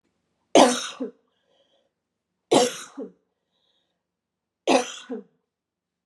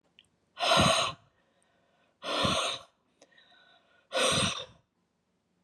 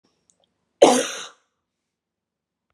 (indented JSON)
{
  "three_cough_length": "6.1 s",
  "three_cough_amplitude": 28121,
  "three_cough_signal_mean_std_ratio": 0.27,
  "exhalation_length": "5.6 s",
  "exhalation_amplitude": 8639,
  "exhalation_signal_mean_std_ratio": 0.43,
  "cough_length": "2.7 s",
  "cough_amplitude": 32512,
  "cough_signal_mean_std_ratio": 0.23,
  "survey_phase": "beta (2021-08-13 to 2022-03-07)",
  "age": "45-64",
  "gender": "Female",
  "wearing_mask": "No",
  "symptom_none": true,
  "smoker_status": "Never smoked",
  "respiratory_condition_asthma": false,
  "respiratory_condition_other": false,
  "recruitment_source": "REACT",
  "submission_delay": "1 day",
  "covid_test_result": "Negative",
  "covid_test_method": "RT-qPCR"
}